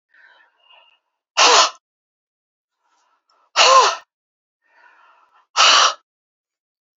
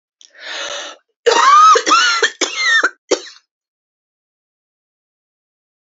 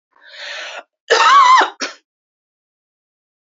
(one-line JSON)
{"exhalation_length": "7.0 s", "exhalation_amplitude": 31347, "exhalation_signal_mean_std_ratio": 0.32, "three_cough_length": "6.0 s", "three_cough_amplitude": 30866, "three_cough_signal_mean_std_ratio": 0.44, "cough_length": "3.4 s", "cough_amplitude": 30153, "cough_signal_mean_std_ratio": 0.4, "survey_phase": "beta (2021-08-13 to 2022-03-07)", "age": "45-64", "gender": "Female", "wearing_mask": "No", "symptom_headache": true, "smoker_status": "Never smoked", "respiratory_condition_asthma": false, "respiratory_condition_other": false, "recruitment_source": "REACT", "submission_delay": "2 days", "covid_test_result": "Negative", "covid_test_method": "RT-qPCR", "influenza_a_test_result": "Negative", "influenza_b_test_result": "Negative"}